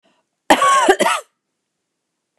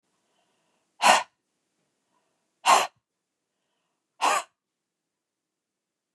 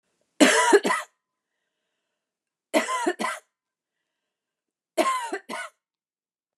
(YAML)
cough_length: 2.4 s
cough_amplitude: 29204
cough_signal_mean_std_ratio: 0.42
exhalation_length: 6.1 s
exhalation_amplitude: 25103
exhalation_signal_mean_std_ratio: 0.23
three_cough_length: 6.6 s
three_cough_amplitude: 27699
three_cough_signal_mean_std_ratio: 0.35
survey_phase: beta (2021-08-13 to 2022-03-07)
age: 45-64
gender: Female
wearing_mask: 'No'
symptom_none: true
symptom_onset: 5 days
smoker_status: Ex-smoker
respiratory_condition_asthma: false
respiratory_condition_other: false
recruitment_source: REACT
submission_delay: 2 days
covid_test_result: Negative
covid_test_method: RT-qPCR
influenza_a_test_result: Negative
influenza_b_test_result: Negative